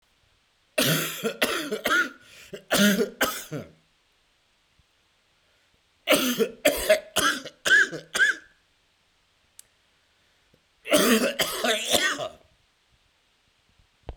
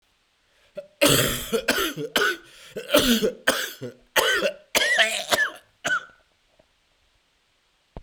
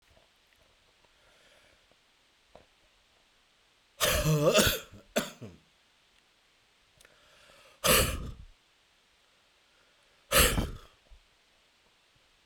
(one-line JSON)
{"three_cough_length": "14.2 s", "three_cough_amplitude": 18074, "three_cough_signal_mean_std_ratio": 0.45, "cough_length": "8.0 s", "cough_amplitude": 23954, "cough_signal_mean_std_ratio": 0.51, "exhalation_length": "12.5 s", "exhalation_amplitude": 13384, "exhalation_signal_mean_std_ratio": 0.31, "survey_phase": "beta (2021-08-13 to 2022-03-07)", "age": "45-64", "gender": "Male", "wearing_mask": "No", "symptom_cough_any": true, "symptom_new_continuous_cough": true, "symptom_runny_or_blocked_nose": true, "symptom_sore_throat": true, "symptom_abdominal_pain": true, "symptom_fatigue": true, "symptom_fever_high_temperature": true, "symptom_headache": true, "symptom_other": true, "symptom_onset": "4 days", "smoker_status": "Never smoked", "respiratory_condition_asthma": false, "respiratory_condition_other": false, "recruitment_source": "Test and Trace", "submission_delay": "1 day", "covid_test_result": "Positive", "covid_test_method": "RT-qPCR", "covid_ct_value": 16.1, "covid_ct_gene": "N gene", "covid_ct_mean": 16.1, "covid_viral_load": "5100000 copies/ml", "covid_viral_load_category": "High viral load (>1M copies/ml)"}